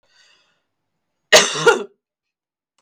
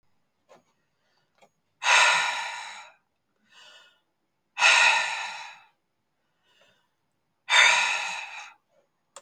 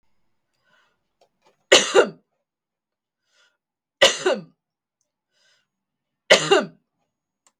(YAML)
cough_length: 2.8 s
cough_amplitude: 32768
cough_signal_mean_std_ratio: 0.27
exhalation_length: 9.2 s
exhalation_amplitude: 19206
exhalation_signal_mean_std_ratio: 0.37
three_cough_length: 7.6 s
three_cough_amplitude: 32768
three_cough_signal_mean_std_ratio: 0.25
survey_phase: beta (2021-08-13 to 2022-03-07)
age: 45-64
gender: Female
wearing_mask: 'No'
symptom_cough_any: true
symptom_runny_or_blocked_nose: true
symptom_sore_throat: true
symptom_fatigue: true
symptom_headache: true
smoker_status: Never smoked
respiratory_condition_asthma: false
respiratory_condition_other: false
recruitment_source: Test and Trace
submission_delay: 1 day
covid_test_result: Positive
covid_test_method: RT-qPCR
covid_ct_value: 24.5
covid_ct_gene: N gene